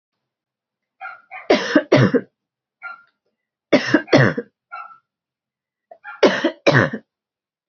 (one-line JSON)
{"three_cough_length": "7.7 s", "three_cough_amplitude": 31825, "three_cough_signal_mean_std_ratio": 0.35, "survey_phase": "beta (2021-08-13 to 2022-03-07)", "age": "45-64", "gender": "Female", "wearing_mask": "No", "symptom_cough_any": true, "symptom_runny_or_blocked_nose": true, "symptom_fatigue": true, "symptom_headache": true, "symptom_change_to_sense_of_smell_or_taste": true, "symptom_loss_of_taste": true, "symptom_other": true, "symptom_onset": "4 days", "smoker_status": "Never smoked", "respiratory_condition_asthma": false, "respiratory_condition_other": false, "recruitment_source": "Test and Trace", "submission_delay": "2 days", "covid_test_result": "Positive", "covid_test_method": "RT-qPCR", "covid_ct_value": 19.0, "covid_ct_gene": "ORF1ab gene"}